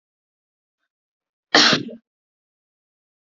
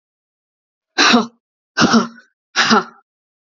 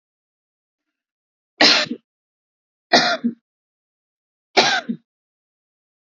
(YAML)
cough_length: 3.3 s
cough_amplitude: 32768
cough_signal_mean_std_ratio: 0.23
exhalation_length: 3.4 s
exhalation_amplitude: 32106
exhalation_signal_mean_std_ratio: 0.4
three_cough_length: 6.1 s
three_cough_amplitude: 31205
three_cough_signal_mean_std_ratio: 0.29
survey_phase: beta (2021-08-13 to 2022-03-07)
age: 18-44
gender: Female
wearing_mask: 'No'
symptom_none: true
symptom_onset: 12 days
smoker_status: Never smoked
respiratory_condition_asthma: false
respiratory_condition_other: false
recruitment_source: REACT
submission_delay: 2 days
covid_test_result: Negative
covid_test_method: RT-qPCR
influenza_a_test_result: Negative
influenza_b_test_result: Negative